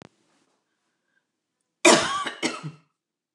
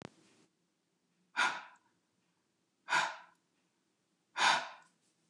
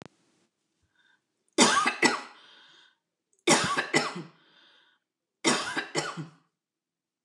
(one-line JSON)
{"cough_length": "3.3 s", "cough_amplitude": 25443, "cough_signal_mean_std_ratio": 0.28, "exhalation_length": "5.3 s", "exhalation_amplitude": 6136, "exhalation_signal_mean_std_ratio": 0.3, "three_cough_length": "7.2 s", "three_cough_amplitude": 19875, "three_cough_signal_mean_std_ratio": 0.37, "survey_phase": "beta (2021-08-13 to 2022-03-07)", "age": "65+", "gender": "Female", "wearing_mask": "No", "symptom_none": true, "smoker_status": "Never smoked", "respiratory_condition_asthma": false, "respiratory_condition_other": false, "recruitment_source": "REACT", "submission_delay": "2 days", "covid_test_result": "Negative", "covid_test_method": "RT-qPCR", "influenza_a_test_result": "Negative", "influenza_b_test_result": "Negative"}